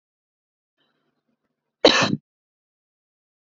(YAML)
cough_length: 3.6 s
cough_amplitude: 27855
cough_signal_mean_std_ratio: 0.2
survey_phase: beta (2021-08-13 to 2022-03-07)
age: 45-64
gender: Female
wearing_mask: 'No'
symptom_none: true
smoker_status: Ex-smoker
respiratory_condition_asthma: false
respiratory_condition_other: false
recruitment_source: REACT
submission_delay: 2 days
covid_test_result: Negative
covid_test_method: RT-qPCR
influenza_a_test_result: Negative
influenza_b_test_result: Negative